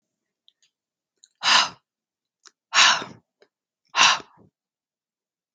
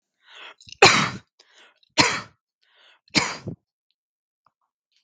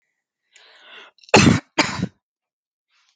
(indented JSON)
{
  "exhalation_length": "5.5 s",
  "exhalation_amplitude": 32258,
  "exhalation_signal_mean_std_ratio": 0.28,
  "three_cough_length": "5.0 s",
  "three_cough_amplitude": 32768,
  "three_cough_signal_mean_std_ratio": 0.26,
  "cough_length": "3.2 s",
  "cough_amplitude": 32768,
  "cough_signal_mean_std_ratio": 0.28,
  "survey_phase": "beta (2021-08-13 to 2022-03-07)",
  "age": "18-44",
  "gender": "Female",
  "wearing_mask": "No",
  "symptom_cough_any": true,
  "symptom_runny_or_blocked_nose": true,
  "symptom_sore_throat": true,
  "symptom_headache": true,
  "symptom_onset": "2 days",
  "smoker_status": "Never smoked",
  "respiratory_condition_asthma": false,
  "respiratory_condition_other": false,
  "recruitment_source": "REACT",
  "submission_delay": "1 day",
  "covid_test_result": "Negative",
  "covid_test_method": "RT-qPCR"
}